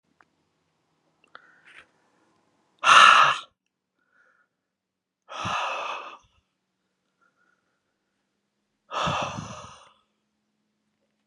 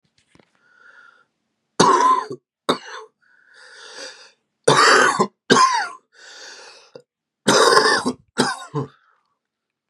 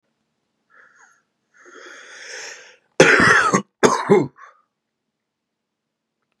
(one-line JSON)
{"exhalation_length": "11.3 s", "exhalation_amplitude": 29899, "exhalation_signal_mean_std_ratio": 0.24, "three_cough_length": "9.9 s", "three_cough_amplitude": 32768, "three_cough_signal_mean_std_ratio": 0.41, "cough_length": "6.4 s", "cough_amplitude": 32768, "cough_signal_mean_std_ratio": 0.32, "survey_phase": "beta (2021-08-13 to 2022-03-07)", "age": "18-44", "gender": "Male", "wearing_mask": "No", "symptom_diarrhoea": true, "smoker_status": "Current smoker (11 or more cigarettes per day)", "respiratory_condition_asthma": false, "respiratory_condition_other": false, "recruitment_source": "REACT", "submission_delay": "1 day", "covid_test_result": "Negative", "covid_test_method": "RT-qPCR", "influenza_a_test_result": "Negative", "influenza_b_test_result": "Negative"}